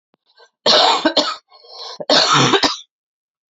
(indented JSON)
{
  "cough_length": "3.5 s",
  "cough_amplitude": 32319,
  "cough_signal_mean_std_ratio": 0.52,
  "survey_phase": "beta (2021-08-13 to 2022-03-07)",
  "age": "18-44",
  "gender": "Female",
  "wearing_mask": "No",
  "symptom_cough_any": true,
  "symptom_fatigue": true,
  "symptom_headache": true,
  "symptom_change_to_sense_of_smell_or_taste": true,
  "symptom_loss_of_taste": true,
  "symptom_other": true,
  "symptom_onset": "4 days",
  "smoker_status": "Never smoked",
  "respiratory_condition_asthma": false,
  "respiratory_condition_other": false,
  "recruitment_source": "Test and Trace",
  "submission_delay": "2 days",
  "covid_test_result": "Positive",
  "covid_test_method": "RT-qPCR",
  "covid_ct_value": 23.9,
  "covid_ct_gene": "N gene"
}